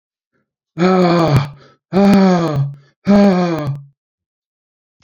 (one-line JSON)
{"exhalation_length": "5.0 s", "exhalation_amplitude": 28316, "exhalation_signal_mean_std_ratio": 0.56, "survey_phase": "beta (2021-08-13 to 2022-03-07)", "age": "65+", "gender": "Male", "wearing_mask": "No", "symptom_cough_any": true, "symptom_shortness_of_breath": true, "symptom_sore_throat": true, "symptom_abdominal_pain": true, "symptom_fatigue": true, "symptom_fever_high_temperature": true, "symptom_headache": true, "symptom_loss_of_taste": true, "symptom_onset": "8 days", "smoker_status": "Never smoked", "respiratory_condition_asthma": false, "respiratory_condition_other": false, "recruitment_source": "Test and Trace", "submission_delay": "2 days", "covid_test_result": "Positive", "covid_test_method": "RT-qPCR", "covid_ct_value": 23.4, "covid_ct_gene": "ORF1ab gene", "covid_ct_mean": 24.0, "covid_viral_load": "14000 copies/ml", "covid_viral_load_category": "Low viral load (10K-1M copies/ml)"}